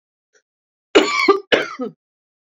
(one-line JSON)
{"cough_length": "2.6 s", "cough_amplitude": 28804, "cough_signal_mean_std_ratio": 0.37, "survey_phase": "beta (2021-08-13 to 2022-03-07)", "age": "45-64", "gender": "Female", "wearing_mask": "No", "symptom_none": true, "smoker_status": "Current smoker (1 to 10 cigarettes per day)", "respiratory_condition_asthma": false, "respiratory_condition_other": false, "recruitment_source": "REACT", "submission_delay": "7 days", "covid_test_result": "Negative", "covid_test_method": "RT-qPCR"}